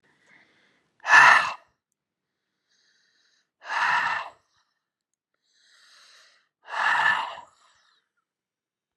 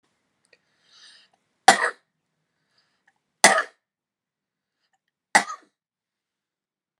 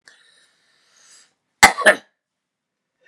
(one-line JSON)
{"exhalation_length": "9.0 s", "exhalation_amplitude": 26436, "exhalation_signal_mean_std_ratio": 0.29, "three_cough_length": "7.0 s", "three_cough_amplitude": 32768, "three_cough_signal_mean_std_ratio": 0.18, "cough_length": "3.1 s", "cough_amplitude": 32768, "cough_signal_mean_std_ratio": 0.19, "survey_phase": "beta (2021-08-13 to 2022-03-07)", "age": "45-64", "gender": "Male", "wearing_mask": "No", "symptom_none": true, "smoker_status": "Never smoked", "respiratory_condition_asthma": false, "respiratory_condition_other": false, "recruitment_source": "REACT", "submission_delay": "1 day", "covid_test_result": "Negative", "covid_test_method": "RT-qPCR", "influenza_a_test_result": "Negative", "influenza_b_test_result": "Negative"}